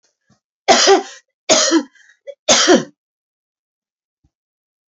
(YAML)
three_cough_length: 4.9 s
three_cough_amplitude: 32767
three_cough_signal_mean_std_ratio: 0.37
survey_phase: beta (2021-08-13 to 2022-03-07)
age: 45-64
gender: Female
wearing_mask: 'No'
symptom_none: true
smoker_status: Never smoked
respiratory_condition_asthma: false
respiratory_condition_other: false
recruitment_source: REACT
submission_delay: 2 days
covid_test_result: Negative
covid_test_method: RT-qPCR
influenza_a_test_result: Unknown/Void
influenza_b_test_result: Unknown/Void